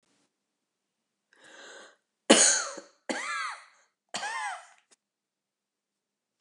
three_cough_length: 6.4 s
three_cough_amplitude: 22866
three_cough_signal_mean_std_ratio: 0.28
survey_phase: beta (2021-08-13 to 2022-03-07)
age: 65+
gender: Female
wearing_mask: 'No'
symptom_none: true
smoker_status: Never smoked
respiratory_condition_asthma: false
respiratory_condition_other: false
recruitment_source: REACT
submission_delay: 2 days
covid_test_result: Negative
covid_test_method: RT-qPCR
influenza_a_test_result: Negative
influenza_b_test_result: Negative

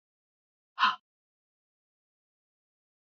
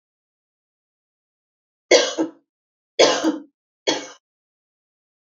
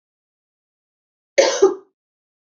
exhalation_length: 3.2 s
exhalation_amplitude: 7340
exhalation_signal_mean_std_ratio: 0.16
three_cough_length: 5.4 s
three_cough_amplitude: 29174
three_cough_signal_mean_std_ratio: 0.28
cough_length: 2.5 s
cough_amplitude: 27724
cough_signal_mean_std_ratio: 0.27
survey_phase: beta (2021-08-13 to 2022-03-07)
age: 45-64
gender: Female
wearing_mask: 'No'
symptom_none: true
smoker_status: Never smoked
respiratory_condition_asthma: false
respiratory_condition_other: false
recruitment_source: REACT
submission_delay: 1 day
covid_test_result: Negative
covid_test_method: RT-qPCR
influenza_a_test_result: Negative
influenza_b_test_result: Negative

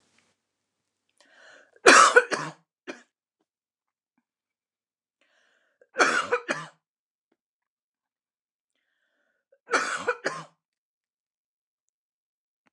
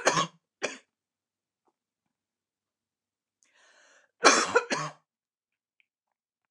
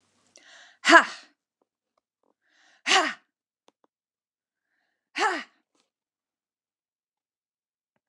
three_cough_length: 12.7 s
three_cough_amplitude: 29203
three_cough_signal_mean_std_ratio: 0.22
cough_length: 6.5 s
cough_amplitude: 21257
cough_signal_mean_std_ratio: 0.24
exhalation_length: 8.1 s
exhalation_amplitude: 27502
exhalation_signal_mean_std_ratio: 0.19
survey_phase: beta (2021-08-13 to 2022-03-07)
age: 45-64
gender: Female
wearing_mask: 'No'
symptom_cough_any: true
symptom_fatigue: true
smoker_status: Never smoked
respiratory_condition_asthma: false
respiratory_condition_other: false
recruitment_source: REACT
submission_delay: 3 days
covid_test_result: Negative
covid_test_method: RT-qPCR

